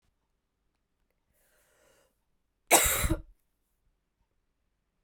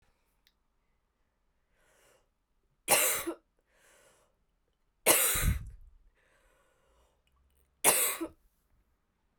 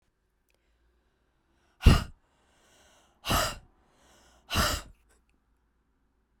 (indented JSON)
{
  "cough_length": "5.0 s",
  "cough_amplitude": 18413,
  "cough_signal_mean_std_ratio": 0.22,
  "three_cough_length": "9.4 s",
  "three_cough_amplitude": 17016,
  "three_cough_signal_mean_std_ratio": 0.3,
  "exhalation_length": "6.4 s",
  "exhalation_amplitude": 18991,
  "exhalation_signal_mean_std_ratio": 0.23,
  "survey_phase": "beta (2021-08-13 to 2022-03-07)",
  "age": "18-44",
  "gender": "Female",
  "wearing_mask": "No",
  "symptom_runny_or_blocked_nose": true,
  "symptom_shortness_of_breath": true,
  "symptom_fatigue": true,
  "symptom_headache": true,
  "symptom_change_to_sense_of_smell_or_taste": true,
  "symptom_onset": "4 days",
  "smoker_status": "Never smoked",
  "respiratory_condition_asthma": true,
  "respiratory_condition_other": false,
  "recruitment_source": "Test and Trace",
  "submission_delay": "2 days",
  "covid_test_result": "Positive",
  "covid_test_method": "RT-qPCR",
  "covid_ct_value": 15.8,
  "covid_ct_gene": "ORF1ab gene",
  "covid_ct_mean": 17.0,
  "covid_viral_load": "2800000 copies/ml",
  "covid_viral_load_category": "High viral load (>1M copies/ml)"
}